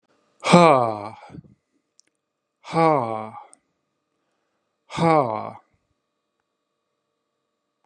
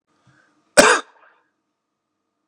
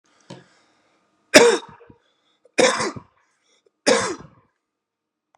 {"exhalation_length": "7.9 s", "exhalation_amplitude": 32128, "exhalation_signal_mean_std_ratio": 0.28, "cough_length": "2.5 s", "cough_amplitude": 32768, "cough_signal_mean_std_ratio": 0.23, "three_cough_length": "5.4 s", "three_cough_amplitude": 32768, "three_cough_signal_mean_std_ratio": 0.28, "survey_phase": "beta (2021-08-13 to 2022-03-07)", "age": "18-44", "gender": "Male", "wearing_mask": "No", "symptom_runny_or_blocked_nose": true, "symptom_shortness_of_breath": true, "symptom_fatigue": true, "symptom_fever_high_temperature": true, "symptom_headache": true, "symptom_onset": "11 days", "smoker_status": "Never smoked", "respiratory_condition_asthma": false, "respiratory_condition_other": false, "recruitment_source": "REACT", "submission_delay": "0 days", "covid_test_result": "Positive", "covid_test_method": "RT-qPCR", "covid_ct_value": 26.0, "covid_ct_gene": "E gene", "influenza_a_test_result": "Negative", "influenza_b_test_result": "Negative"}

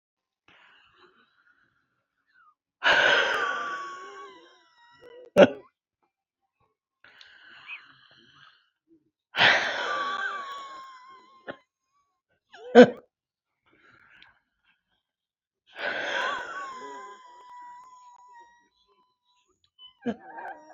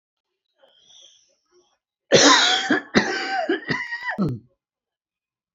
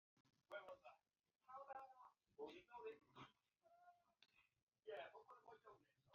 {"exhalation_length": "20.7 s", "exhalation_amplitude": 27523, "exhalation_signal_mean_std_ratio": 0.26, "cough_length": "5.5 s", "cough_amplitude": 30071, "cough_signal_mean_std_ratio": 0.43, "three_cough_length": "6.1 s", "three_cough_amplitude": 301, "three_cough_signal_mean_std_ratio": 0.51, "survey_phase": "beta (2021-08-13 to 2022-03-07)", "age": "45-64", "gender": "Male", "wearing_mask": "No", "symptom_runny_or_blocked_nose": true, "smoker_status": "Ex-smoker", "respiratory_condition_asthma": false, "respiratory_condition_other": true, "recruitment_source": "REACT", "submission_delay": "3 days", "covid_test_result": "Negative", "covid_test_method": "RT-qPCR", "influenza_a_test_result": "Negative", "influenza_b_test_result": "Negative"}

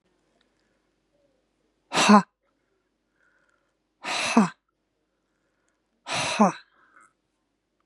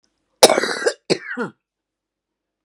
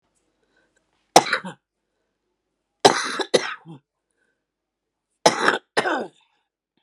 {"exhalation_length": "7.9 s", "exhalation_amplitude": 27084, "exhalation_signal_mean_std_ratio": 0.25, "cough_length": "2.6 s", "cough_amplitude": 32768, "cough_signal_mean_std_ratio": 0.3, "three_cough_length": "6.8 s", "three_cough_amplitude": 32768, "three_cough_signal_mean_std_ratio": 0.27, "survey_phase": "beta (2021-08-13 to 2022-03-07)", "age": "45-64", "gender": "Female", "wearing_mask": "No", "symptom_none": true, "smoker_status": "Current smoker (11 or more cigarettes per day)", "respiratory_condition_asthma": false, "respiratory_condition_other": true, "recruitment_source": "REACT", "submission_delay": "3 days", "covid_test_result": "Negative", "covid_test_method": "RT-qPCR"}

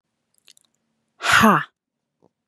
{"exhalation_length": "2.5 s", "exhalation_amplitude": 31413, "exhalation_signal_mean_std_ratio": 0.31, "survey_phase": "beta (2021-08-13 to 2022-03-07)", "age": "18-44", "gender": "Female", "wearing_mask": "No", "symptom_none": true, "smoker_status": "Never smoked", "respiratory_condition_asthma": false, "respiratory_condition_other": false, "recruitment_source": "REACT", "submission_delay": "1 day", "covid_test_result": "Negative", "covid_test_method": "RT-qPCR", "influenza_a_test_result": "Negative", "influenza_b_test_result": "Negative"}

